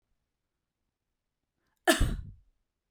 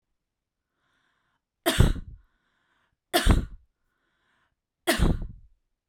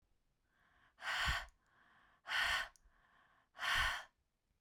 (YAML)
cough_length: 2.9 s
cough_amplitude: 13786
cough_signal_mean_std_ratio: 0.24
three_cough_length: 5.9 s
three_cough_amplitude: 23692
three_cough_signal_mean_std_ratio: 0.31
exhalation_length: 4.6 s
exhalation_amplitude: 1949
exhalation_signal_mean_std_ratio: 0.44
survey_phase: beta (2021-08-13 to 2022-03-07)
age: 45-64
gender: Female
wearing_mask: 'No'
symptom_none: true
symptom_onset: 5 days
smoker_status: Never smoked
respiratory_condition_asthma: false
respiratory_condition_other: false
recruitment_source: REACT
submission_delay: 0 days
covid_test_result: Negative
covid_test_method: RT-qPCR